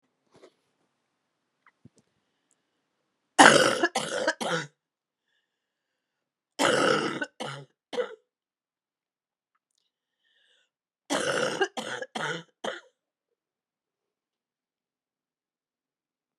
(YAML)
three_cough_length: 16.4 s
three_cough_amplitude: 32411
three_cough_signal_mean_std_ratio: 0.27
survey_phase: beta (2021-08-13 to 2022-03-07)
age: 45-64
gender: Female
wearing_mask: 'No'
symptom_cough_any: true
symptom_new_continuous_cough: true
symptom_runny_or_blocked_nose: true
symptom_sore_throat: true
symptom_abdominal_pain: true
symptom_fatigue: true
symptom_headache: true
symptom_other: true
symptom_onset: 3 days
smoker_status: Never smoked
respiratory_condition_asthma: false
respiratory_condition_other: false
recruitment_source: Test and Trace
submission_delay: 1 day
covid_test_result: Positive
covid_test_method: RT-qPCR